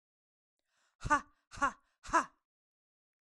{"exhalation_length": "3.3 s", "exhalation_amplitude": 5328, "exhalation_signal_mean_std_ratio": 0.25, "survey_phase": "beta (2021-08-13 to 2022-03-07)", "age": "18-44", "gender": "Female", "wearing_mask": "No", "symptom_fatigue": true, "symptom_headache": true, "symptom_change_to_sense_of_smell_or_taste": true, "symptom_loss_of_taste": true, "symptom_other": true, "symptom_onset": "5 days", "smoker_status": "Never smoked", "respiratory_condition_asthma": false, "respiratory_condition_other": false, "recruitment_source": "Test and Trace", "submission_delay": "2 days", "covid_test_result": "Positive", "covid_test_method": "RT-qPCR", "covid_ct_value": 13.4, "covid_ct_gene": "N gene", "covid_ct_mean": 13.8, "covid_viral_load": "30000000 copies/ml", "covid_viral_load_category": "High viral load (>1M copies/ml)"}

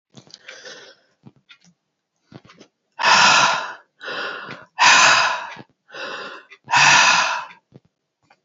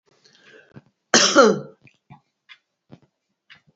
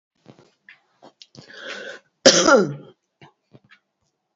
{"exhalation_length": "8.4 s", "exhalation_amplitude": 30896, "exhalation_signal_mean_std_ratio": 0.44, "three_cough_length": "3.8 s", "three_cough_amplitude": 32767, "three_cough_signal_mean_std_ratio": 0.27, "cough_length": "4.4 s", "cough_amplitude": 30893, "cough_signal_mean_std_ratio": 0.27, "survey_phase": "alpha (2021-03-01 to 2021-08-12)", "age": "65+", "gender": "Female", "wearing_mask": "No", "symptom_none": true, "smoker_status": "Never smoked", "respiratory_condition_asthma": false, "respiratory_condition_other": false, "recruitment_source": "REACT", "submission_delay": "3 days", "covid_test_result": "Negative", "covid_test_method": "RT-qPCR"}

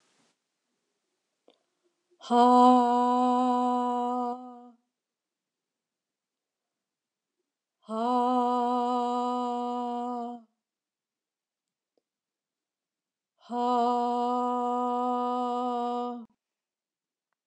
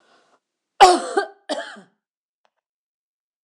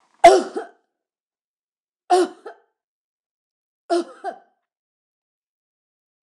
{"exhalation_length": "17.5 s", "exhalation_amplitude": 13892, "exhalation_signal_mean_std_ratio": 0.47, "cough_length": "3.4 s", "cough_amplitude": 26028, "cough_signal_mean_std_ratio": 0.24, "three_cough_length": "6.2 s", "three_cough_amplitude": 26028, "three_cough_signal_mean_std_ratio": 0.22, "survey_phase": "beta (2021-08-13 to 2022-03-07)", "age": "65+", "gender": "Female", "wearing_mask": "No", "symptom_none": true, "smoker_status": "Never smoked", "respiratory_condition_asthma": false, "respiratory_condition_other": false, "recruitment_source": "REACT", "submission_delay": "0 days", "covid_test_result": "Negative", "covid_test_method": "RT-qPCR"}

